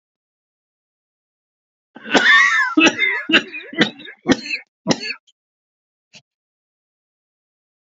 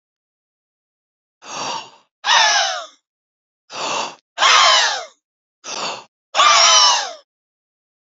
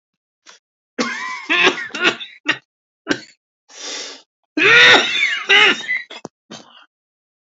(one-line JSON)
{"cough_length": "7.9 s", "cough_amplitude": 30499, "cough_signal_mean_std_ratio": 0.36, "exhalation_length": "8.0 s", "exhalation_amplitude": 32768, "exhalation_signal_mean_std_ratio": 0.45, "three_cough_length": "7.4 s", "three_cough_amplitude": 30061, "three_cough_signal_mean_std_ratio": 0.43, "survey_phase": "beta (2021-08-13 to 2022-03-07)", "age": "18-44", "gender": "Male", "wearing_mask": "Yes", "symptom_none": true, "smoker_status": "Never smoked", "respiratory_condition_asthma": true, "respiratory_condition_other": true, "recruitment_source": "Test and Trace", "submission_delay": "0 days", "covid_test_result": "Positive", "covid_test_method": "RT-qPCR", "covid_ct_value": 26.5, "covid_ct_gene": "ORF1ab gene"}